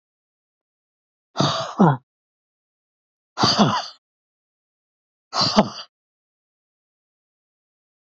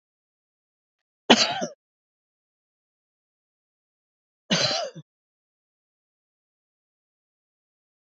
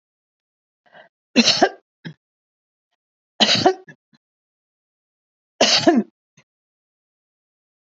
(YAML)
exhalation_length: 8.2 s
exhalation_amplitude: 27280
exhalation_signal_mean_std_ratio: 0.29
cough_length: 8.0 s
cough_amplitude: 28606
cough_signal_mean_std_ratio: 0.2
three_cough_length: 7.9 s
three_cough_amplitude: 30399
three_cough_signal_mean_std_ratio: 0.28
survey_phase: alpha (2021-03-01 to 2021-08-12)
age: 65+
gender: Female
wearing_mask: 'No'
symptom_none: true
smoker_status: Ex-smoker
respiratory_condition_asthma: false
respiratory_condition_other: false
recruitment_source: REACT
submission_delay: 2 days
covid_test_result: Negative
covid_test_method: RT-qPCR